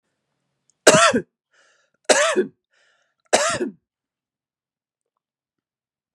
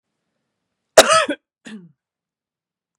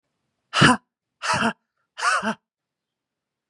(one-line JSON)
{"three_cough_length": "6.1 s", "three_cough_amplitude": 32768, "three_cough_signal_mean_std_ratio": 0.3, "cough_length": "3.0 s", "cough_amplitude": 32768, "cough_signal_mean_std_ratio": 0.23, "exhalation_length": "3.5 s", "exhalation_amplitude": 29762, "exhalation_signal_mean_std_ratio": 0.35, "survey_phase": "beta (2021-08-13 to 2022-03-07)", "age": "18-44", "gender": "Female", "wearing_mask": "No", "symptom_headache": true, "symptom_onset": "12 days", "smoker_status": "Ex-smoker", "respiratory_condition_asthma": false, "respiratory_condition_other": false, "recruitment_source": "REACT", "submission_delay": "1 day", "covid_test_result": "Negative", "covid_test_method": "RT-qPCR", "influenza_a_test_result": "Negative", "influenza_b_test_result": "Negative"}